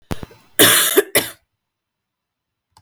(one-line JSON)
{"cough_length": "2.8 s", "cough_amplitude": 32768, "cough_signal_mean_std_ratio": 0.36, "survey_phase": "beta (2021-08-13 to 2022-03-07)", "age": "45-64", "gender": "Female", "wearing_mask": "No", "symptom_cough_any": true, "symptom_fatigue": true, "symptom_fever_high_temperature": true, "symptom_headache": true, "smoker_status": "Ex-smoker", "respiratory_condition_asthma": false, "respiratory_condition_other": false, "recruitment_source": "Test and Trace", "submission_delay": "2 days", "covid_test_result": "Positive", "covid_test_method": "RT-qPCR"}